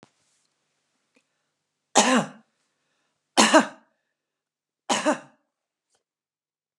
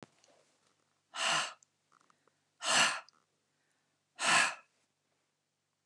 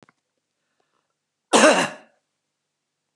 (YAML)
three_cough_length: 6.8 s
three_cough_amplitude: 31654
three_cough_signal_mean_std_ratio: 0.25
exhalation_length: 5.9 s
exhalation_amplitude: 5933
exhalation_signal_mean_std_ratio: 0.33
cough_length: 3.2 s
cough_amplitude: 28823
cough_signal_mean_std_ratio: 0.26
survey_phase: beta (2021-08-13 to 2022-03-07)
age: 65+
gender: Female
wearing_mask: 'No'
symptom_none: true
symptom_onset: 8 days
smoker_status: Ex-smoker
respiratory_condition_asthma: false
respiratory_condition_other: false
recruitment_source: REACT
submission_delay: 1 day
covid_test_result: Negative
covid_test_method: RT-qPCR
influenza_a_test_result: Negative
influenza_b_test_result: Negative